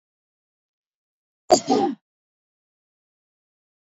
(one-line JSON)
{"cough_length": "3.9 s", "cough_amplitude": 26498, "cough_signal_mean_std_ratio": 0.21, "survey_phase": "beta (2021-08-13 to 2022-03-07)", "age": "18-44", "gender": "Female", "wearing_mask": "No", "symptom_none": true, "smoker_status": "Never smoked", "respiratory_condition_asthma": false, "respiratory_condition_other": false, "recruitment_source": "REACT", "submission_delay": "2 days", "covid_test_result": "Negative", "covid_test_method": "RT-qPCR", "influenza_a_test_result": "Negative", "influenza_b_test_result": "Negative"}